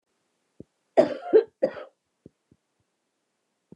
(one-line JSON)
{"cough_length": "3.8 s", "cough_amplitude": 18486, "cough_signal_mean_std_ratio": 0.23, "survey_phase": "beta (2021-08-13 to 2022-03-07)", "age": "45-64", "gender": "Female", "wearing_mask": "No", "symptom_cough_any": true, "symptom_runny_or_blocked_nose": true, "smoker_status": "Never smoked", "respiratory_condition_asthma": false, "respiratory_condition_other": false, "recruitment_source": "Test and Trace", "submission_delay": "2 days", "covid_test_result": "Positive", "covid_test_method": "RT-qPCR", "covid_ct_value": 14.6, "covid_ct_gene": "ORF1ab gene", "covid_ct_mean": 15.0, "covid_viral_load": "12000000 copies/ml", "covid_viral_load_category": "High viral load (>1M copies/ml)"}